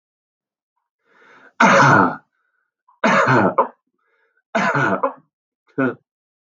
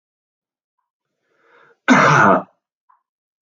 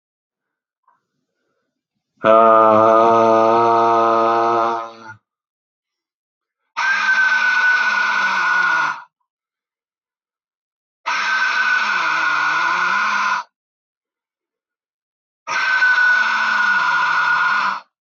{
  "three_cough_length": "6.5 s",
  "three_cough_amplitude": 32109,
  "three_cough_signal_mean_std_ratio": 0.43,
  "cough_length": "3.4 s",
  "cough_amplitude": 32374,
  "cough_signal_mean_std_ratio": 0.33,
  "exhalation_length": "18.0 s",
  "exhalation_amplitude": 32768,
  "exhalation_signal_mean_std_ratio": 0.68,
  "survey_phase": "beta (2021-08-13 to 2022-03-07)",
  "age": "45-64",
  "gender": "Male",
  "wearing_mask": "No",
  "symptom_none": true,
  "smoker_status": "Never smoked",
  "respiratory_condition_asthma": true,
  "respiratory_condition_other": false,
  "recruitment_source": "REACT",
  "submission_delay": "3 days",
  "covid_test_result": "Negative",
  "covid_test_method": "RT-qPCR",
  "influenza_a_test_result": "Negative",
  "influenza_b_test_result": "Negative"
}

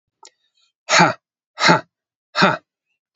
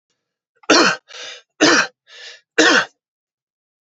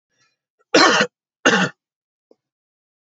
{
  "exhalation_length": "3.2 s",
  "exhalation_amplitude": 30482,
  "exhalation_signal_mean_std_ratio": 0.35,
  "three_cough_length": "3.8 s",
  "three_cough_amplitude": 30845,
  "three_cough_signal_mean_std_ratio": 0.39,
  "cough_length": "3.1 s",
  "cough_amplitude": 28879,
  "cough_signal_mean_std_ratio": 0.33,
  "survey_phase": "beta (2021-08-13 to 2022-03-07)",
  "age": "18-44",
  "gender": "Male",
  "wearing_mask": "No",
  "symptom_none": true,
  "smoker_status": "Ex-smoker",
  "respiratory_condition_asthma": true,
  "respiratory_condition_other": false,
  "recruitment_source": "REACT",
  "submission_delay": "0 days",
  "covid_test_result": "Negative",
  "covid_test_method": "RT-qPCR",
  "covid_ct_value": 47.0,
  "covid_ct_gene": "N gene"
}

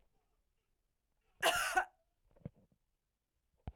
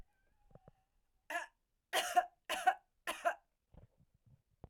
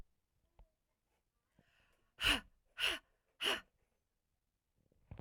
{
  "cough_length": "3.8 s",
  "cough_amplitude": 3909,
  "cough_signal_mean_std_ratio": 0.27,
  "three_cough_length": "4.7 s",
  "three_cough_amplitude": 3778,
  "three_cough_signal_mean_std_ratio": 0.3,
  "exhalation_length": "5.2 s",
  "exhalation_amplitude": 3744,
  "exhalation_signal_mean_std_ratio": 0.27,
  "survey_phase": "alpha (2021-03-01 to 2021-08-12)",
  "age": "18-44",
  "gender": "Female",
  "wearing_mask": "No",
  "symptom_none": true,
  "smoker_status": "Never smoked",
  "respiratory_condition_asthma": false,
  "respiratory_condition_other": false,
  "recruitment_source": "REACT",
  "submission_delay": "3 days",
  "covid_test_result": "Negative",
  "covid_test_method": "RT-qPCR"
}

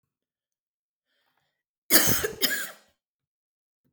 {
  "cough_length": "3.9 s",
  "cough_amplitude": 26214,
  "cough_signal_mean_std_ratio": 0.29,
  "survey_phase": "alpha (2021-03-01 to 2021-08-12)",
  "age": "45-64",
  "gender": "Female",
  "wearing_mask": "No",
  "symptom_none": true,
  "smoker_status": "Ex-smoker",
  "respiratory_condition_asthma": false,
  "respiratory_condition_other": false,
  "recruitment_source": "REACT",
  "submission_delay": "3 days",
  "covid_test_result": "Negative",
  "covid_test_method": "RT-qPCR"
}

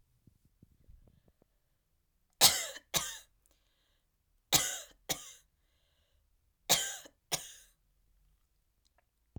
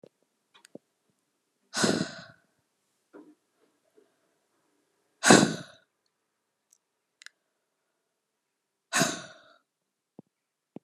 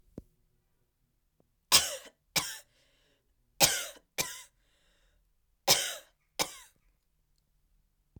{
  "three_cough_length": "9.4 s",
  "three_cough_amplitude": 12907,
  "three_cough_signal_mean_std_ratio": 0.23,
  "exhalation_length": "10.8 s",
  "exhalation_amplitude": 27730,
  "exhalation_signal_mean_std_ratio": 0.2,
  "cough_length": "8.2 s",
  "cough_amplitude": 17033,
  "cough_signal_mean_std_ratio": 0.25,
  "survey_phase": "alpha (2021-03-01 to 2021-08-12)",
  "age": "18-44",
  "gender": "Female",
  "wearing_mask": "No",
  "symptom_change_to_sense_of_smell_or_taste": true,
  "symptom_loss_of_taste": true,
  "symptom_onset": "6 days",
  "smoker_status": "Never smoked",
  "respiratory_condition_asthma": false,
  "respiratory_condition_other": false,
  "recruitment_source": "Test and Trace",
  "submission_delay": "1 day",
  "covid_test_result": "Positive",
  "covid_test_method": "RT-qPCR"
}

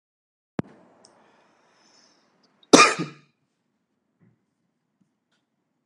{
  "cough_length": "5.9 s",
  "cough_amplitude": 32768,
  "cough_signal_mean_std_ratio": 0.15,
  "survey_phase": "beta (2021-08-13 to 2022-03-07)",
  "age": "18-44",
  "gender": "Male",
  "wearing_mask": "No",
  "symptom_cough_any": true,
  "symptom_sore_throat": true,
  "symptom_other": true,
  "smoker_status": "Never smoked",
  "respiratory_condition_asthma": false,
  "respiratory_condition_other": false,
  "recruitment_source": "Test and Trace",
  "submission_delay": "1 day",
  "covid_test_result": "Negative",
  "covid_test_method": "RT-qPCR"
}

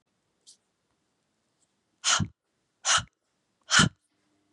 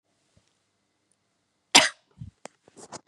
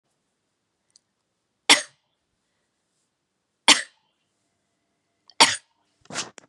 {
  "exhalation_length": "4.5 s",
  "exhalation_amplitude": 16237,
  "exhalation_signal_mean_std_ratio": 0.27,
  "cough_length": "3.1 s",
  "cough_amplitude": 31180,
  "cough_signal_mean_std_ratio": 0.17,
  "three_cough_length": "6.5 s",
  "three_cough_amplitude": 32216,
  "three_cough_signal_mean_std_ratio": 0.17,
  "survey_phase": "beta (2021-08-13 to 2022-03-07)",
  "age": "45-64",
  "gender": "Female",
  "wearing_mask": "No",
  "symptom_cough_any": true,
  "symptom_runny_or_blocked_nose": true,
  "symptom_onset": "3 days",
  "smoker_status": "Ex-smoker",
  "respiratory_condition_asthma": false,
  "respiratory_condition_other": false,
  "recruitment_source": "Test and Trace",
  "submission_delay": "1 day",
  "covid_test_result": "Positive",
  "covid_test_method": "ePCR"
}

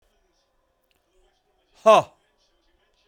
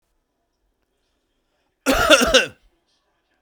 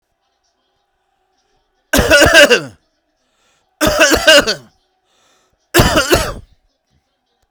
{
  "exhalation_length": "3.1 s",
  "exhalation_amplitude": 27261,
  "exhalation_signal_mean_std_ratio": 0.19,
  "cough_length": "3.4 s",
  "cough_amplitude": 32768,
  "cough_signal_mean_std_ratio": 0.31,
  "three_cough_length": "7.5 s",
  "three_cough_amplitude": 32768,
  "three_cough_signal_mean_std_ratio": 0.39,
  "survey_phase": "beta (2021-08-13 to 2022-03-07)",
  "age": "45-64",
  "gender": "Male",
  "wearing_mask": "Yes",
  "symptom_none": true,
  "smoker_status": "Never smoked",
  "respiratory_condition_asthma": false,
  "respiratory_condition_other": false,
  "recruitment_source": "REACT",
  "submission_delay": "3 days",
  "covid_test_result": "Negative",
  "covid_test_method": "RT-qPCR",
  "influenza_a_test_result": "Negative",
  "influenza_b_test_result": "Negative"
}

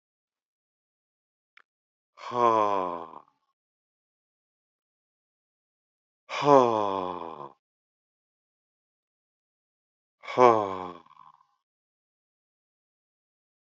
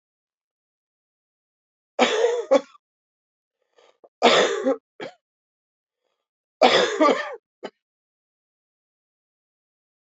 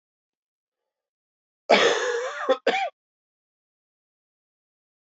{
  "exhalation_length": "13.7 s",
  "exhalation_amplitude": 21882,
  "exhalation_signal_mean_std_ratio": 0.23,
  "three_cough_length": "10.2 s",
  "three_cough_amplitude": 27116,
  "three_cough_signal_mean_std_ratio": 0.31,
  "cough_length": "5.0 s",
  "cough_amplitude": 21873,
  "cough_signal_mean_std_ratio": 0.33,
  "survey_phase": "beta (2021-08-13 to 2022-03-07)",
  "age": "65+",
  "gender": "Male",
  "wearing_mask": "No",
  "symptom_none": true,
  "symptom_onset": "2 days",
  "smoker_status": "Never smoked",
  "respiratory_condition_asthma": false,
  "respiratory_condition_other": false,
  "recruitment_source": "Test and Trace",
  "submission_delay": "2 days",
  "covid_test_result": "Positive",
  "covid_test_method": "RT-qPCR",
  "covid_ct_value": 20.0,
  "covid_ct_gene": "ORF1ab gene",
  "covid_ct_mean": 20.6,
  "covid_viral_load": "180000 copies/ml",
  "covid_viral_load_category": "Low viral load (10K-1M copies/ml)"
}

